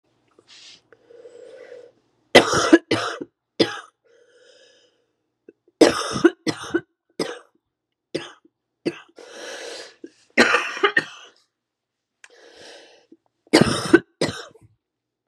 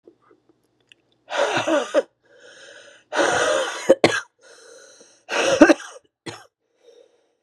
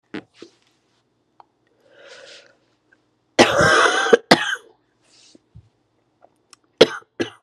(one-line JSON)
{"three_cough_length": "15.3 s", "three_cough_amplitude": 32768, "three_cough_signal_mean_std_ratio": 0.29, "exhalation_length": "7.4 s", "exhalation_amplitude": 32768, "exhalation_signal_mean_std_ratio": 0.38, "cough_length": "7.4 s", "cough_amplitude": 32768, "cough_signal_mean_std_ratio": 0.29, "survey_phase": "beta (2021-08-13 to 2022-03-07)", "age": "45-64", "gender": "Female", "wearing_mask": "No", "symptom_runny_or_blocked_nose": true, "symptom_shortness_of_breath": true, "symptom_sore_throat": true, "symptom_fatigue": true, "symptom_change_to_sense_of_smell_or_taste": true, "symptom_loss_of_taste": true, "symptom_onset": "8 days", "smoker_status": "Ex-smoker", "respiratory_condition_asthma": false, "respiratory_condition_other": false, "recruitment_source": "Test and Trace", "submission_delay": "1 day", "covid_test_result": "Positive", "covid_test_method": "RT-qPCR", "covid_ct_value": 31.8, "covid_ct_gene": "ORF1ab gene", "covid_ct_mean": 32.1, "covid_viral_load": "30 copies/ml", "covid_viral_load_category": "Minimal viral load (< 10K copies/ml)"}